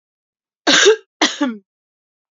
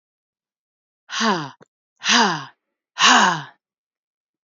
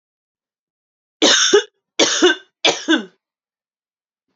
{
  "cough_length": "2.3 s",
  "cough_amplitude": 32473,
  "cough_signal_mean_std_ratio": 0.38,
  "exhalation_length": "4.4 s",
  "exhalation_amplitude": 28606,
  "exhalation_signal_mean_std_ratio": 0.38,
  "three_cough_length": "4.4 s",
  "three_cough_amplitude": 32767,
  "three_cough_signal_mean_std_ratio": 0.38,
  "survey_phase": "beta (2021-08-13 to 2022-03-07)",
  "age": "45-64",
  "gender": "Female",
  "wearing_mask": "No",
  "symptom_cough_any": true,
  "symptom_runny_or_blocked_nose": true,
  "symptom_fatigue": true,
  "symptom_fever_high_temperature": true,
  "symptom_headache": true,
  "smoker_status": "Never smoked",
  "respiratory_condition_asthma": false,
  "respiratory_condition_other": false,
  "recruitment_source": "Test and Trace",
  "submission_delay": "1 day",
  "covid_test_result": "Positive",
  "covid_test_method": "RT-qPCR",
  "covid_ct_value": 35.3,
  "covid_ct_gene": "N gene"
}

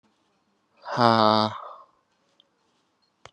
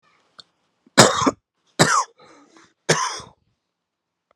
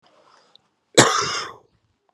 {
  "exhalation_length": "3.3 s",
  "exhalation_amplitude": 25408,
  "exhalation_signal_mean_std_ratio": 0.27,
  "three_cough_length": "4.4 s",
  "three_cough_amplitude": 32768,
  "three_cough_signal_mean_std_ratio": 0.31,
  "cough_length": "2.1 s",
  "cough_amplitude": 32768,
  "cough_signal_mean_std_ratio": 0.31,
  "survey_phase": "beta (2021-08-13 to 2022-03-07)",
  "age": "18-44",
  "gender": "Male",
  "wearing_mask": "No",
  "symptom_cough_any": true,
  "symptom_runny_or_blocked_nose": true,
  "symptom_shortness_of_breath": true,
  "symptom_sore_throat": true,
  "symptom_abdominal_pain": true,
  "symptom_diarrhoea": true,
  "symptom_fatigue": true,
  "symptom_fever_high_temperature": true,
  "symptom_headache": true,
  "symptom_change_to_sense_of_smell_or_taste": true,
  "symptom_onset": "4 days",
  "smoker_status": "Ex-smoker",
  "respiratory_condition_asthma": false,
  "respiratory_condition_other": false,
  "recruitment_source": "Test and Trace",
  "submission_delay": "2 days",
  "covid_test_result": "Positive",
  "covid_test_method": "RT-qPCR",
  "covid_ct_value": 18.7,
  "covid_ct_gene": "ORF1ab gene"
}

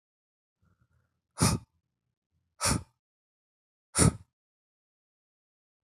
{
  "exhalation_length": "6.0 s",
  "exhalation_amplitude": 12394,
  "exhalation_signal_mean_std_ratio": 0.22,
  "survey_phase": "beta (2021-08-13 to 2022-03-07)",
  "age": "18-44",
  "gender": "Male",
  "wearing_mask": "No",
  "symptom_none": true,
  "symptom_onset": "6 days",
  "smoker_status": "Never smoked",
  "respiratory_condition_asthma": false,
  "respiratory_condition_other": false,
  "recruitment_source": "Test and Trace",
  "submission_delay": "2 days",
  "covid_test_result": "Positive",
  "covid_test_method": "RT-qPCR",
  "covid_ct_value": 15.8,
  "covid_ct_gene": "ORF1ab gene",
  "covid_ct_mean": 16.0,
  "covid_viral_load": "5700000 copies/ml",
  "covid_viral_load_category": "High viral load (>1M copies/ml)"
}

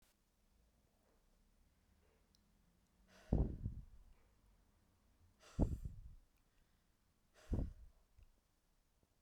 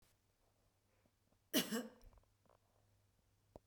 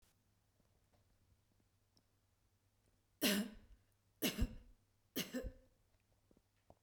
{
  "exhalation_length": "9.2 s",
  "exhalation_amplitude": 3075,
  "exhalation_signal_mean_std_ratio": 0.27,
  "cough_length": "3.7 s",
  "cough_amplitude": 2611,
  "cough_signal_mean_std_ratio": 0.24,
  "three_cough_length": "6.8 s",
  "three_cough_amplitude": 2593,
  "three_cough_signal_mean_std_ratio": 0.29,
  "survey_phase": "beta (2021-08-13 to 2022-03-07)",
  "age": "45-64",
  "gender": "Female",
  "wearing_mask": "No",
  "symptom_none": true,
  "smoker_status": "Ex-smoker",
  "respiratory_condition_asthma": false,
  "respiratory_condition_other": false,
  "recruitment_source": "REACT",
  "submission_delay": "2 days",
  "covid_test_result": "Negative",
  "covid_test_method": "RT-qPCR",
  "influenza_a_test_result": "Negative",
  "influenza_b_test_result": "Negative"
}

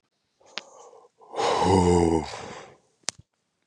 {
  "exhalation_length": "3.7 s",
  "exhalation_amplitude": 29548,
  "exhalation_signal_mean_std_ratio": 0.43,
  "survey_phase": "beta (2021-08-13 to 2022-03-07)",
  "age": "45-64",
  "gender": "Male",
  "wearing_mask": "No",
  "symptom_other": true,
  "smoker_status": "Never smoked",
  "respiratory_condition_asthma": false,
  "respiratory_condition_other": false,
  "recruitment_source": "Test and Trace",
  "submission_delay": "2 days",
  "covid_test_result": "Positive",
  "covid_test_method": "RT-qPCR",
  "covid_ct_value": 29.8,
  "covid_ct_gene": "ORF1ab gene",
  "covid_ct_mean": 30.4,
  "covid_viral_load": "110 copies/ml",
  "covid_viral_load_category": "Minimal viral load (< 10K copies/ml)"
}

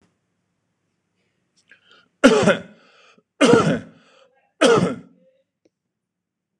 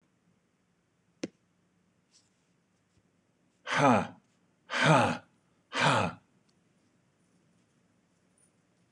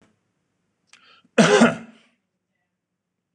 {
  "three_cough_length": "6.6 s",
  "three_cough_amplitude": 26028,
  "three_cough_signal_mean_std_ratio": 0.32,
  "exhalation_length": "8.9 s",
  "exhalation_amplitude": 10453,
  "exhalation_signal_mean_std_ratio": 0.29,
  "cough_length": "3.3 s",
  "cough_amplitude": 24448,
  "cough_signal_mean_std_ratio": 0.26,
  "survey_phase": "beta (2021-08-13 to 2022-03-07)",
  "age": "45-64",
  "gender": "Male",
  "wearing_mask": "No",
  "symptom_none": true,
  "smoker_status": "Ex-smoker",
  "respiratory_condition_asthma": false,
  "respiratory_condition_other": false,
  "recruitment_source": "REACT",
  "submission_delay": "5 days",
  "covid_test_result": "Negative",
  "covid_test_method": "RT-qPCR"
}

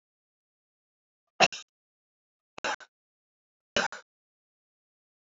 {
  "three_cough_length": "5.3 s",
  "three_cough_amplitude": 14989,
  "three_cough_signal_mean_std_ratio": 0.17,
  "survey_phase": "beta (2021-08-13 to 2022-03-07)",
  "age": "65+",
  "gender": "Male",
  "wearing_mask": "No",
  "symptom_none": true,
  "smoker_status": "Ex-smoker",
  "respiratory_condition_asthma": false,
  "respiratory_condition_other": false,
  "recruitment_source": "REACT",
  "submission_delay": "1 day",
  "covid_test_result": "Negative",
  "covid_test_method": "RT-qPCR"
}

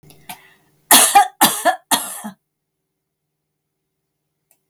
{
  "cough_length": "4.7 s",
  "cough_amplitude": 32768,
  "cough_signal_mean_std_ratio": 0.32,
  "survey_phase": "beta (2021-08-13 to 2022-03-07)",
  "age": "45-64",
  "gender": "Female",
  "wearing_mask": "No",
  "symptom_none": true,
  "symptom_onset": "13 days",
  "smoker_status": "Never smoked",
  "respiratory_condition_asthma": false,
  "respiratory_condition_other": false,
  "recruitment_source": "REACT",
  "submission_delay": "3 days",
  "covid_test_result": "Negative",
  "covid_test_method": "RT-qPCR",
  "influenza_a_test_result": "Negative",
  "influenza_b_test_result": "Negative"
}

